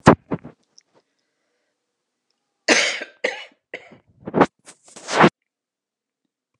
{"cough_length": "6.6 s", "cough_amplitude": 32768, "cough_signal_mean_std_ratio": 0.25, "survey_phase": "alpha (2021-03-01 to 2021-08-12)", "age": "65+", "gender": "Female", "wearing_mask": "No", "symptom_none": true, "smoker_status": "Never smoked", "respiratory_condition_asthma": false, "respiratory_condition_other": false, "recruitment_source": "REACT", "submission_delay": "3 days", "covid_test_result": "Negative", "covid_test_method": "RT-qPCR"}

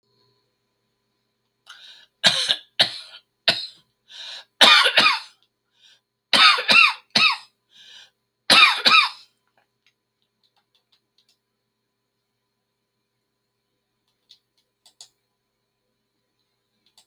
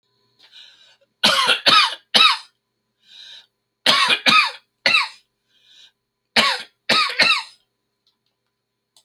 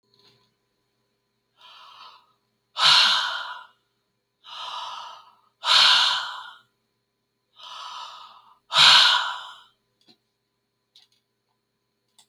{"cough_length": "17.1 s", "cough_amplitude": 32767, "cough_signal_mean_std_ratio": 0.28, "three_cough_length": "9.0 s", "three_cough_amplitude": 32412, "three_cough_signal_mean_std_ratio": 0.41, "exhalation_length": "12.3 s", "exhalation_amplitude": 27056, "exhalation_signal_mean_std_ratio": 0.33, "survey_phase": "beta (2021-08-13 to 2022-03-07)", "age": "65+", "gender": "Male", "wearing_mask": "No", "symptom_none": true, "smoker_status": "Never smoked", "respiratory_condition_asthma": false, "respiratory_condition_other": false, "recruitment_source": "REACT", "submission_delay": "1 day", "covid_test_result": "Negative", "covid_test_method": "RT-qPCR"}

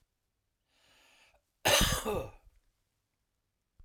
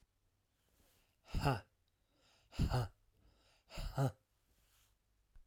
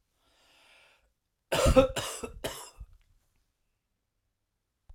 {"cough_length": "3.8 s", "cough_amplitude": 8246, "cough_signal_mean_std_ratio": 0.3, "exhalation_length": "5.5 s", "exhalation_amplitude": 2277, "exhalation_signal_mean_std_ratio": 0.34, "three_cough_length": "4.9 s", "three_cough_amplitude": 16014, "three_cough_signal_mean_std_ratio": 0.27, "survey_phase": "alpha (2021-03-01 to 2021-08-12)", "age": "45-64", "gender": "Male", "wearing_mask": "No", "symptom_abdominal_pain": true, "symptom_fever_high_temperature": true, "symptom_headache": true, "symptom_onset": "2 days", "smoker_status": "Never smoked", "respiratory_condition_asthma": false, "respiratory_condition_other": false, "recruitment_source": "Test and Trace", "submission_delay": "2 days", "covid_test_result": "Positive", "covid_test_method": "RT-qPCR"}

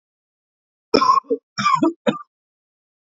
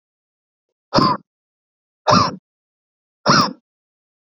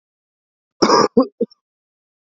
{"three_cough_length": "3.2 s", "three_cough_amplitude": 27483, "three_cough_signal_mean_std_ratio": 0.38, "exhalation_length": "4.4 s", "exhalation_amplitude": 32714, "exhalation_signal_mean_std_ratio": 0.32, "cough_length": "2.4 s", "cough_amplitude": 32768, "cough_signal_mean_std_ratio": 0.31, "survey_phase": "beta (2021-08-13 to 2022-03-07)", "age": "18-44", "gender": "Male", "wearing_mask": "No", "symptom_cough_any": true, "symptom_new_continuous_cough": true, "symptom_runny_or_blocked_nose": true, "symptom_shortness_of_breath": true, "symptom_sore_throat": true, "symptom_abdominal_pain": true, "symptom_fatigue": true, "symptom_fever_high_temperature": true, "symptom_headache": true, "symptom_onset": "3 days", "smoker_status": "Never smoked", "respiratory_condition_asthma": false, "respiratory_condition_other": false, "recruitment_source": "Test and Trace", "submission_delay": "1 day", "covid_test_result": "Positive", "covid_test_method": "RT-qPCR", "covid_ct_value": 18.8, "covid_ct_gene": "N gene"}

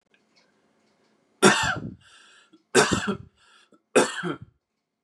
{"three_cough_length": "5.0 s", "three_cough_amplitude": 27559, "three_cough_signal_mean_std_ratio": 0.33, "survey_phase": "beta (2021-08-13 to 2022-03-07)", "age": "18-44", "gender": "Male", "wearing_mask": "No", "symptom_cough_any": true, "symptom_runny_or_blocked_nose": true, "symptom_fatigue": true, "symptom_fever_high_temperature": true, "symptom_onset": "4 days", "smoker_status": "Never smoked", "respiratory_condition_asthma": false, "respiratory_condition_other": false, "recruitment_source": "Test and Trace", "submission_delay": "2 days", "covid_test_result": "Positive", "covid_test_method": "RT-qPCR", "covid_ct_value": 26.2, "covid_ct_gene": "ORF1ab gene", "covid_ct_mean": 26.6, "covid_viral_load": "1900 copies/ml", "covid_viral_load_category": "Minimal viral load (< 10K copies/ml)"}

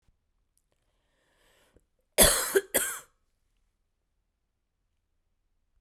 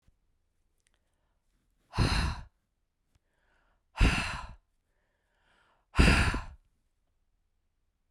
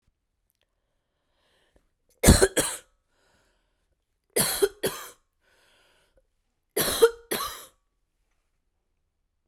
{"cough_length": "5.8 s", "cough_amplitude": 18551, "cough_signal_mean_std_ratio": 0.22, "exhalation_length": "8.1 s", "exhalation_amplitude": 12973, "exhalation_signal_mean_std_ratio": 0.3, "three_cough_length": "9.5 s", "three_cough_amplitude": 29105, "three_cough_signal_mean_std_ratio": 0.25, "survey_phase": "beta (2021-08-13 to 2022-03-07)", "age": "45-64", "gender": "Female", "wearing_mask": "No", "symptom_cough_any": true, "symptom_runny_or_blocked_nose": true, "symptom_fatigue": true, "symptom_headache": true, "symptom_change_to_sense_of_smell_or_taste": true, "smoker_status": "Never smoked", "respiratory_condition_asthma": false, "respiratory_condition_other": false, "recruitment_source": "Test and Trace", "submission_delay": "2 days", "covid_test_result": "Positive", "covid_test_method": "RT-qPCR", "covid_ct_value": 23.6, "covid_ct_gene": "ORF1ab gene"}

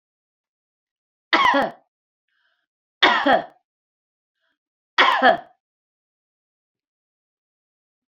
{"three_cough_length": "8.1 s", "three_cough_amplitude": 32767, "three_cough_signal_mean_std_ratio": 0.28, "survey_phase": "beta (2021-08-13 to 2022-03-07)", "age": "65+", "gender": "Female", "wearing_mask": "No", "symptom_none": true, "smoker_status": "Never smoked", "respiratory_condition_asthma": false, "respiratory_condition_other": false, "recruitment_source": "REACT", "submission_delay": "2 days", "covid_test_result": "Negative", "covid_test_method": "RT-qPCR"}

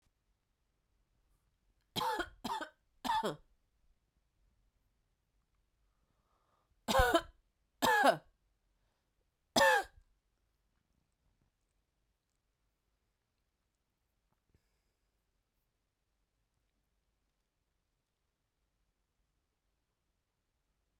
{"three_cough_length": "21.0 s", "three_cough_amplitude": 5961, "three_cough_signal_mean_std_ratio": 0.21, "survey_phase": "beta (2021-08-13 to 2022-03-07)", "age": "18-44", "gender": "Female", "wearing_mask": "No", "symptom_cough_any": true, "symptom_runny_or_blocked_nose": true, "symptom_sore_throat": true, "symptom_fatigue": true, "symptom_headache": true, "symptom_onset": "3 days", "smoker_status": "Ex-smoker", "respiratory_condition_asthma": false, "respiratory_condition_other": false, "recruitment_source": "Test and Trace", "submission_delay": "2 days", "covid_test_result": "Positive", "covid_test_method": "ePCR"}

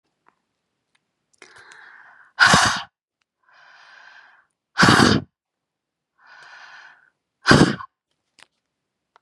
{"exhalation_length": "9.2 s", "exhalation_amplitude": 32767, "exhalation_signal_mean_std_ratio": 0.28, "survey_phase": "beta (2021-08-13 to 2022-03-07)", "age": "18-44", "gender": "Female", "wearing_mask": "No", "symptom_cough_any": true, "symptom_runny_or_blocked_nose": true, "symptom_headache": true, "symptom_change_to_sense_of_smell_or_taste": true, "symptom_loss_of_taste": true, "symptom_onset": "4 days", "smoker_status": "Never smoked", "respiratory_condition_asthma": true, "respiratory_condition_other": false, "recruitment_source": "Test and Trace", "submission_delay": "2 days", "covid_test_result": "Positive", "covid_test_method": "RT-qPCR", "covid_ct_value": 13.0, "covid_ct_gene": "ORF1ab gene", "covid_ct_mean": 13.4, "covid_viral_load": "40000000 copies/ml", "covid_viral_load_category": "High viral load (>1M copies/ml)"}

